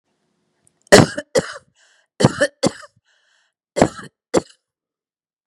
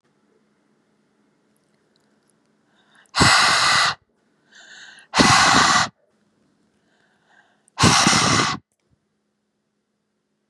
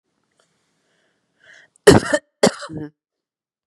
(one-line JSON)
{"three_cough_length": "5.5 s", "three_cough_amplitude": 32768, "three_cough_signal_mean_std_ratio": 0.25, "exhalation_length": "10.5 s", "exhalation_amplitude": 31442, "exhalation_signal_mean_std_ratio": 0.39, "cough_length": "3.7 s", "cough_amplitude": 32768, "cough_signal_mean_std_ratio": 0.23, "survey_phase": "beta (2021-08-13 to 2022-03-07)", "age": "45-64", "gender": "Female", "wearing_mask": "No", "symptom_none": true, "symptom_onset": "12 days", "smoker_status": "Ex-smoker", "respiratory_condition_asthma": false, "respiratory_condition_other": false, "recruitment_source": "REACT", "submission_delay": "2 days", "covid_test_result": "Negative", "covid_test_method": "RT-qPCR", "influenza_a_test_result": "Negative", "influenza_b_test_result": "Negative"}